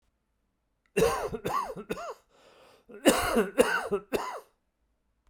{"cough_length": "5.3 s", "cough_amplitude": 16054, "cough_signal_mean_std_ratio": 0.45, "survey_phase": "beta (2021-08-13 to 2022-03-07)", "age": "45-64", "gender": "Male", "wearing_mask": "No", "symptom_cough_any": true, "symptom_runny_or_blocked_nose": true, "symptom_onset": "6 days", "smoker_status": "Never smoked", "respiratory_condition_asthma": false, "respiratory_condition_other": false, "recruitment_source": "Test and Trace", "submission_delay": "3 days", "covid_test_result": "Positive", "covid_test_method": "RT-qPCR", "covid_ct_value": 10.8, "covid_ct_gene": "ORF1ab gene", "covid_ct_mean": 11.9, "covid_viral_load": "130000000 copies/ml", "covid_viral_load_category": "High viral load (>1M copies/ml)"}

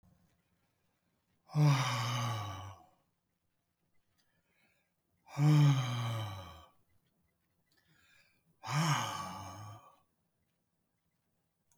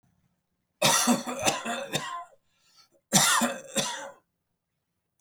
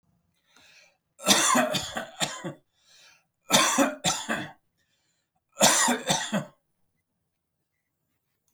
{"exhalation_length": "11.8 s", "exhalation_amplitude": 4676, "exhalation_signal_mean_std_ratio": 0.38, "cough_length": "5.2 s", "cough_amplitude": 16920, "cough_signal_mean_std_ratio": 0.46, "three_cough_length": "8.5 s", "three_cough_amplitude": 21098, "three_cough_signal_mean_std_ratio": 0.41, "survey_phase": "beta (2021-08-13 to 2022-03-07)", "age": "65+", "gender": "Male", "wearing_mask": "No", "symptom_none": true, "smoker_status": "Never smoked", "respiratory_condition_asthma": false, "respiratory_condition_other": false, "recruitment_source": "REACT", "submission_delay": "1 day", "covid_test_result": "Negative", "covid_test_method": "RT-qPCR"}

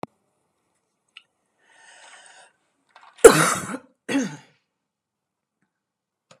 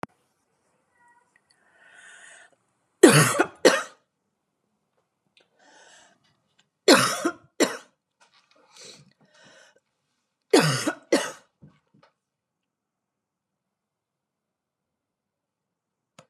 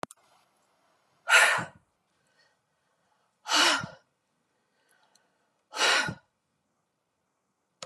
{"cough_length": "6.4 s", "cough_amplitude": 32768, "cough_signal_mean_std_ratio": 0.18, "three_cough_length": "16.3 s", "three_cough_amplitude": 32676, "three_cough_signal_mean_std_ratio": 0.22, "exhalation_length": "7.9 s", "exhalation_amplitude": 17005, "exhalation_signal_mean_std_ratio": 0.29, "survey_phase": "beta (2021-08-13 to 2022-03-07)", "age": "45-64", "gender": "Female", "wearing_mask": "No", "symptom_none": true, "smoker_status": "Never smoked", "respiratory_condition_asthma": false, "respiratory_condition_other": false, "recruitment_source": "REACT", "submission_delay": "3 days", "covid_test_result": "Negative", "covid_test_method": "RT-qPCR", "influenza_a_test_result": "Negative", "influenza_b_test_result": "Negative"}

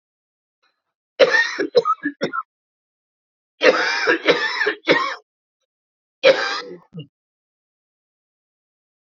{"three_cough_length": "9.1 s", "three_cough_amplitude": 32492, "three_cough_signal_mean_std_ratio": 0.39, "survey_phase": "beta (2021-08-13 to 2022-03-07)", "age": "45-64", "gender": "Male", "wearing_mask": "No", "symptom_cough_any": true, "symptom_runny_or_blocked_nose": true, "symptom_sore_throat": true, "symptom_fatigue": true, "symptom_headache": true, "symptom_onset": "2 days", "smoker_status": "Ex-smoker", "respiratory_condition_asthma": false, "respiratory_condition_other": false, "recruitment_source": "Test and Trace", "submission_delay": "2 days", "covid_test_result": "Positive", "covid_test_method": "LAMP"}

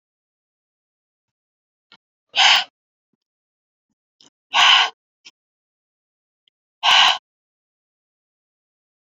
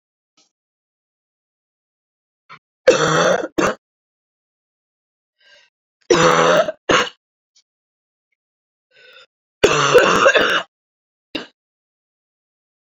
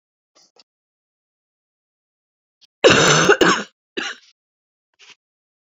{"exhalation_length": "9.0 s", "exhalation_amplitude": 28347, "exhalation_signal_mean_std_ratio": 0.26, "three_cough_length": "12.9 s", "three_cough_amplitude": 32767, "three_cough_signal_mean_std_ratio": 0.34, "cough_length": "5.6 s", "cough_amplitude": 30686, "cough_signal_mean_std_ratio": 0.3, "survey_phase": "beta (2021-08-13 to 2022-03-07)", "age": "45-64", "gender": "Female", "wearing_mask": "No", "symptom_cough_any": true, "symptom_runny_or_blocked_nose": true, "symptom_sore_throat": true, "symptom_fatigue": true, "symptom_headache": true, "symptom_change_to_sense_of_smell_or_taste": true, "symptom_loss_of_taste": true, "symptom_other": true, "smoker_status": "Never smoked", "respiratory_condition_asthma": false, "respiratory_condition_other": false, "recruitment_source": "Test and Trace", "submission_delay": "2 days", "covid_test_result": "Positive", "covid_test_method": "RT-qPCR", "covid_ct_value": 15.4, "covid_ct_gene": "ORF1ab gene", "covid_ct_mean": 15.7, "covid_viral_load": "6900000 copies/ml", "covid_viral_load_category": "High viral load (>1M copies/ml)"}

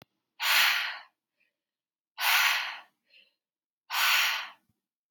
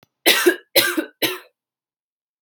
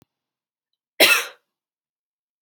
{"exhalation_length": "5.1 s", "exhalation_amplitude": 10533, "exhalation_signal_mean_std_ratio": 0.46, "three_cough_length": "2.4 s", "three_cough_amplitude": 32768, "three_cough_signal_mean_std_ratio": 0.4, "cough_length": "2.4 s", "cough_amplitude": 29774, "cough_signal_mean_std_ratio": 0.24, "survey_phase": "alpha (2021-03-01 to 2021-08-12)", "age": "18-44", "gender": "Female", "wearing_mask": "No", "symptom_none": true, "smoker_status": "Never smoked", "respiratory_condition_asthma": false, "respiratory_condition_other": false, "recruitment_source": "Test and Trace", "submission_delay": "1 day", "covid_test_result": "Positive", "covid_test_method": "RT-qPCR", "covid_ct_value": 21.2, "covid_ct_gene": "ORF1ab gene"}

